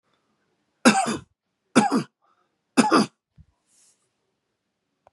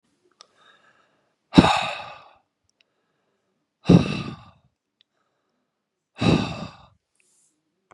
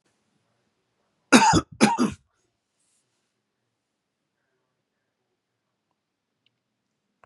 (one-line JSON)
{"three_cough_length": "5.1 s", "three_cough_amplitude": 27846, "three_cough_signal_mean_std_ratio": 0.3, "exhalation_length": "7.9 s", "exhalation_amplitude": 32768, "exhalation_signal_mean_std_ratio": 0.24, "cough_length": "7.3 s", "cough_amplitude": 29957, "cough_signal_mean_std_ratio": 0.21, "survey_phase": "beta (2021-08-13 to 2022-03-07)", "age": "45-64", "gender": "Male", "wearing_mask": "No", "symptom_cough_any": true, "symptom_runny_or_blocked_nose": true, "symptom_onset": "12 days", "smoker_status": "Never smoked", "respiratory_condition_asthma": false, "respiratory_condition_other": false, "recruitment_source": "REACT", "submission_delay": "3 days", "covid_test_result": "Negative", "covid_test_method": "RT-qPCR", "influenza_a_test_result": "Negative", "influenza_b_test_result": "Negative"}